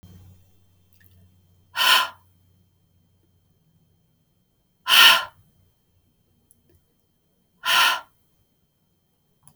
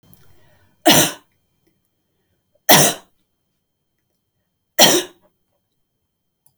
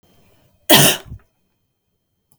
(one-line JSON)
{"exhalation_length": "9.6 s", "exhalation_amplitude": 31337, "exhalation_signal_mean_std_ratio": 0.25, "three_cough_length": "6.6 s", "three_cough_amplitude": 32768, "three_cough_signal_mean_std_ratio": 0.26, "cough_length": "2.4 s", "cough_amplitude": 32768, "cough_signal_mean_std_ratio": 0.28, "survey_phase": "beta (2021-08-13 to 2022-03-07)", "age": "45-64", "gender": "Female", "wearing_mask": "No", "symptom_none": true, "smoker_status": "Never smoked", "respiratory_condition_asthma": false, "respiratory_condition_other": false, "recruitment_source": "REACT", "submission_delay": "1 day", "covid_test_result": "Negative", "covid_test_method": "RT-qPCR"}